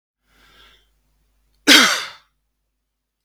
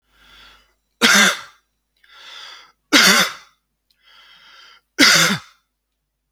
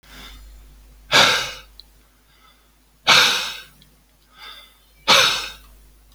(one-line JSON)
{"cough_length": "3.2 s", "cough_amplitude": 32238, "cough_signal_mean_std_ratio": 0.25, "three_cough_length": "6.3 s", "three_cough_amplitude": 32768, "three_cough_signal_mean_std_ratio": 0.35, "exhalation_length": "6.1 s", "exhalation_amplitude": 30751, "exhalation_signal_mean_std_ratio": 0.37, "survey_phase": "alpha (2021-03-01 to 2021-08-12)", "age": "45-64", "gender": "Male", "wearing_mask": "No", "symptom_none": true, "smoker_status": "Ex-smoker", "respiratory_condition_asthma": false, "respiratory_condition_other": false, "recruitment_source": "REACT", "submission_delay": "1 day", "covid_test_result": "Negative", "covid_test_method": "RT-qPCR"}